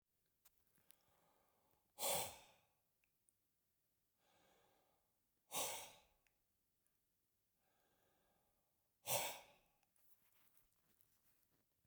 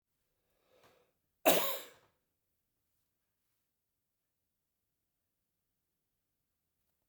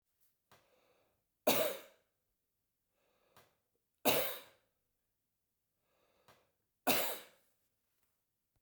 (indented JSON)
{
  "exhalation_length": "11.9 s",
  "exhalation_amplitude": 1337,
  "exhalation_signal_mean_std_ratio": 0.25,
  "cough_length": "7.1 s",
  "cough_amplitude": 9021,
  "cough_signal_mean_std_ratio": 0.16,
  "three_cough_length": "8.6 s",
  "three_cough_amplitude": 5471,
  "three_cough_signal_mean_std_ratio": 0.25,
  "survey_phase": "beta (2021-08-13 to 2022-03-07)",
  "age": "65+",
  "gender": "Male",
  "wearing_mask": "No",
  "symptom_fatigue": true,
  "symptom_headache": true,
  "symptom_onset": "7 days",
  "smoker_status": "Ex-smoker",
  "respiratory_condition_asthma": false,
  "respiratory_condition_other": false,
  "recruitment_source": "REACT",
  "submission_delay": "1 day",
  "covid_test_result": "Negative",
  "covid_test_method": "RT-qPCR"
}